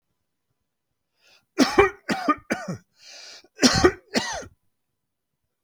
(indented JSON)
{
  "cough_length": "5.6 s",
  "cough_amplitude": 27337,
  "cough_signal_mean_std_ratio": 0.33,
  "survey_phase": "beta (2021-08-13 to 2022-03-07)",
  "age": "45-64",
  "gender": "Male",
  "wearing_mask": "No",
  "symptom_none": true,
  "smoker_status": "Never smoked",
  "respiratory_condition_asthma": false,
  "respiratory_condition_other": false,
  "recruitment_source": "REACT",
  "submission_delay": "2 days",
  "covid_test_result": "Negative",
  "covid_test_method": "RT-qPCR"
}